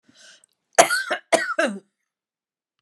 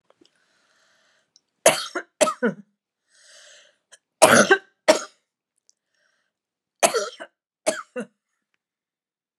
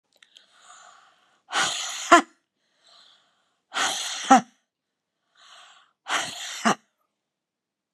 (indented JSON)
{
  "cough_length": "2.8 s",
  "cough_amplitude": 32767,
  "cough_signal_mean_std_ratio": 0.34,
  "three_cough_length": "9.4 s",
  "three_cough_amplitude": 32768,
  "three_cough_signal_mean_std_ratio": 0.25,
  "exhalation_length": "7.9 s",
  "exhalation_amplitude": 32767,
  "exhalation_signal_mean_std_ratio": 0.27,
  "survey_phase": "beta (2021-08-13 to 2022-03-07)",
  "age": "65+",
  "gender": "Female",
  "wearing_mask": "No",
  "symptom_none": true,
  "smoker_status": "Never smoked",
  "respiratory_condition_asthma": true,
  "respiratory_condition_other": false,
  "recruitment_source": "REACT",
  "submission_delay": "2 days",
  "covid_test_result": "Negative",
  "covid_test_method": "RT-qPCR",
  "influenza_a_test_result": "Negative",
  "influenza_b_test_result": "Negative"
}